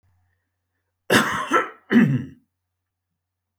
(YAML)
cough_length: 3.6 s
cough_amplitude: 26234
cough_signal_mean_std_ratio: 0.37
survey_phase: beta (2021-08-13 to 2022-03-07)
age: 45-64
gender: Male
wearing_mask: 'No'
symptom_none: true
symptom_onset: 5 days
smoker_status: Never smoked
respiratory_condition_asthma: false
respiratory_condition_other: false
recruitment_source: REACT
submission_delay: 2 days
covid_test_result: Negative
covid_test_method: RT-qPCR